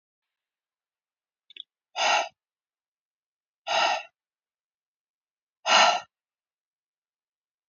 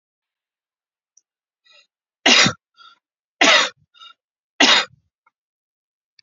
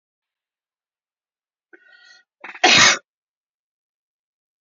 {"exhalation_length": "7.7 s", "exhalation_amplitude": 16682, "exhalation_signal_mean_std_ratio": 0.27, "three_cough_length": "6.2 s", "three_cough_amplitude": 31855, "three_cough_signal_mean_std_ratio": 0.28, "cough_length": "4.6 s", "cough_amplitude": 30390, "cough_signal_mean_std_ratio": 0.22, "survey_phase": "beta (2021-08-13 to 2022-03-07)", "age": "45-64", "gender": "Male", "wearing_mask": "No", "symptom_none": true, "symptom_onset": "12 days", "smoker_status": "Ex-smoker", "respiratory_condition_asthma": false, "respiratory_condition_other": false, "recruitment_source": "REACT", "submission_delay": "1 day", "covid_test_result": "Negative", "covid_test_method": "RT-qPCR", "influenza_a_test_result": "Negative", "influenza_b_test_result": "Negative"}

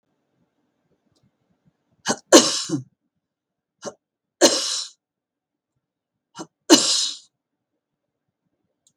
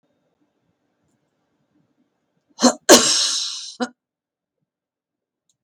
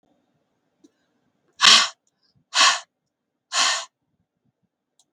{"three_cough_length": "9.0 s", "three_cough_amplitude": 32768, "three_cough_signal_mean_std_ratio": 0.25, "cough_length": "5.6 s", "cough_amplitude": 32768, "cough_signal_mean_std_ratio": 0.26, "exhalation_length": "5.1 s", "exhalation_amplitude": 32766, "exhalation_signal_mean_std_ratio": 0.28, "survey_phase": "beta (2021-08-13 to 2022-03-07)", "age": "65+", "gender": "Female", "wearing_mask": "No", "symptom_none": true, "smoker_status": "Never smoked", "respiratory_condition_asthma": false, "respiratory_condition_other": false, "recruitment_source": "REACT", "submission_delay": "1 day", "covid_test_result": "Negative", "covid_test_method": "RT-qPCR", "influenza_a_test_result": "Negative", "influenza_b_test_result": "Negative"}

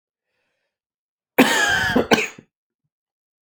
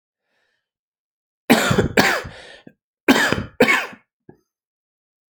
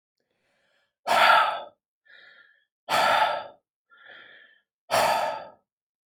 {"cough_length": "3.5 s", "cough_amplitude": 28652, "cough_signal_mean_std_ratio": 0.37, "three_cough_length": "5.3 s", "three_cough_amplitude": 32527, "three_cough_signal_mean_std_ratio": 0.37, "exhalation_length": "6.1 s", "exhalation_amplitude": 16822, "exhalation_signal_mean_std_ratio": 0.41, "survey_phase": "alpha (2021-03-01 to 2021-08-12)", "age": "18-44", "gender": "Male", "wearing_mask": "No", "symptom_cough_any": true, "symptom_new_continuous_cough": true, "symptom_change_to_sense_of_smell_or_taste": true, "symptom_onset": "5 days", "smoker_status": "Ex-smoker", "respiratory_condition_asthma": false, "respiratory_condition_other": false, "recruitment_source": "Test and Trace", "submission_delay": "2 days", "covid_test_result": "Positive", "covid_test_method": "RT-qPCR", "covid_ct_value": 19.4, "covid_ct_gene": "ORF1ab gene", "covid_ct_mean": 19.9, "covid_viral_load": "290000 copies/ml", "covid_viral_load_category": "Low viral load (10K-1M copies/ml)"}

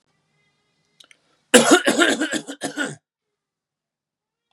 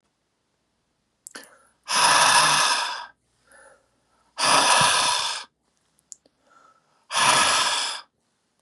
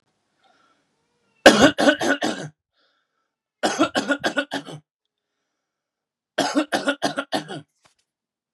{"cough_length": "4.5 s", "cough_amplitude": 32768, "cough_signal_mean_std_ratio": 0.32, "exhalation_length": "8.6 s", "exhalation_amplitude": 22778, "exhalation_signal_mean_std_ratio": 0.49, "three_cough_length": "8.5 s", "three_cough_amplitude": 32768, "three_cough_signal_mean_std_ratio": 0.34, "survey_phase": "beta (2021-08-13 to 2022-03-07)", "age": "45-64", "gender": "Male", "wearing_mask": "No", "symptom_cough_any": true, "symptom_sore_throat": true, "symptom_fever_high_temperature": true, "symptom_onset": "4 days", "smoker_status": "Never smoked", "respiratory_condition_asthma": false, "respiratory_condition_other": false, "recruitment_source": "Test and Trace", "submission_delay": "2 days", "covid_test_result": "Positive", "covid_test_method": "RT-qPCR", "covid_ct_value": 20.8, "covid_ct_gene": "N gene"}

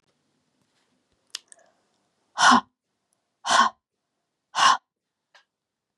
{"exhalation_length": "6.0 s", "exhalation_amplitude": 22544, "exhalation_signal_mean_std_ratio": 0.26, "survey_phase": "beta (2021-08-13 to 2022-03-07)", "age": "45-64", "gender": "Female", "wearing_mask": "No", "symptom_none": true, "symptom_onset": "5 days", "smoker_status": "Never smoked", "respiratory_condition_asthma": true, "respiratory_condition_other": false, "recruitment_source": "REACT", "submission_delay": "2 days", "covid_test_result": "Negative", "covid_test_method": "RT-qPCR", "influenza_a_test_result": "Negative", "influenza_b_test_result": "Negative"}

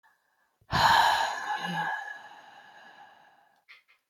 {"exhalation_length": "4.1 s", "exhalation_amplitude": 11421, "exhalation_signal_mean_std_ratio": 0.46, "survey_phase": "beta (2021-08-13 to 2022-03-07)", "age": "18-44", "gender": "Female", "wearing_mask": "No", "symptom_none": true, "symptom_onset": "11 days", "smoker_status": "Never smoked", "respiratory_condition_asthma": true, "respiratory_condition_other": false, "recruitment_source": "REACT", "submission_delay": "4 days", "covid_test_result": "Negative", "covid_test_method": "RT-qPCR", "influenza_a_test_result": "Negative", "influenza_b_test_result": "Negative"}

